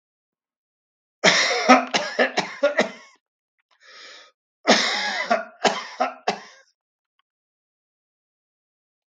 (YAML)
cough_length: 9.1 s
cough_amplitude: 32768
cough_signal_mean_std_ratio: 0.37
survey_phase: beta (2021-08-13 to 2022-03-07)
age: 65+
gender: Male
wearing_mask: 'No'
symptom_none: true
smoker_status: Ex-smoker
respiratory_condition_asthma: false
respiratory_condition_other: false
recruitment_source: REACT
submission_delay: 2 days
covid_test_result: Negative
covid_test_method: RT-qPCR
influenza_a_test_result: Negative
influenza_b_test_result: Negative